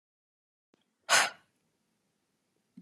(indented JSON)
{
  "exhalation_length": "2.8 s",
  "exhalation_amplitude": 9838,
  "exhalation_signal_mean_std_ratio": 0.21,
  "survey_phase": "alpha (2021-03-01 to 2021-08-12)",
  "age": "18-44",
  "gender": "Female",
  "wearing_mask": "No",
  "symptom_none": true,
  "smoker_status": "Never smoked",
  "respiratory_condition_asthma": false,
  "respiratory_condition_other": false,
  "recruitment_source": "REACT",
  "submission_delay": "4 days",
  "covid_test_result": "Negative",
  "covid_test_method": "RT-qPCR"
}